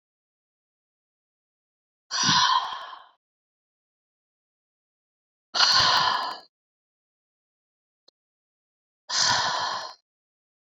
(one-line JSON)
{"exhalation_length": "10.8 s", "exhalation_amplitude": 18043, "exhalation_signal_mean_std_ratio": 0.35, "survey_phase": "beta (2021-08-13 to 2022-03-07)", "age": "45-64", "gender": "Female", "wearing_mask": "No", "symptom_runny_or_blocked_nose": true, "symptom_headache": true, "smoker_status": "Never smoked", "respiratory_condition_asthma": false, "respiratory_condition_other": false, "recruitment_source": "Test and Trace", "submission_delay": "1 day", "covid_test_result": "Positive", "covid_test_method": "ePCR"}